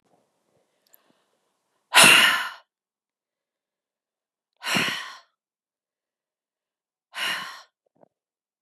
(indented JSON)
{
  "exhalation_length": "8.6 s",
  "exhalation_amplitude": 30360,
  "exhalation_signal_mean_std_ratio": 0.25,
  "survey_phase": "beta (2021-08-13 to 2022-03-07)",
  "age": "45-64",
  "gender": "Female",
  "wearing_mask": "No",
  "symptom_runny_or_blocked_nose": true,
  "symptom_headache": true,
  "symptom_other": true,
  "symptom_onset": "3 days",
  "smoker_status": "Never smoked",
  "respiratory_condition_asthma": false,
  "respiratory_condition_other": false,
  "recruitment_source": "Test and Trace",
  "submission_delay": "1 day",
  "covid_test_result": "Positive",
  "covid_test_method": "RT-qPCR",
  "covid_ct_value": 12.5,
  "covid_ct_gene": "ORF1ab gene",
  "covid_ct_mean": 14.0,
  "covid_viral_load": "26000000 copies/ml",
  "covid_viral_load_category": "High viral load (>1M copies/ml)"
}